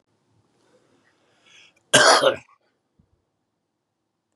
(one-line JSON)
{"exhalation_length": "4.4 s", "exhalation_amplitude": 30442, "exhalation_signal_mean_std_ratio": 0.24, "survey_phase": "beta (2021-08-13 to 2022-03-07)", "age": "45-64", "gender": "Male", "wearing_mask": "No", "symptom_none": true, "smoker_status": "Current smoker (11 or more cigarettes per day)", "respiratory_condition_asthma": false, "respiratory_condition_other": false, "recruitment_source": "REACT", "submission_delay": "2 days", "covid_test_result": "Negative", "covid_test_method": "RT-qPCR", "influenza_a_test_result": "Negative", "influenza_b_test_result": "Negative"}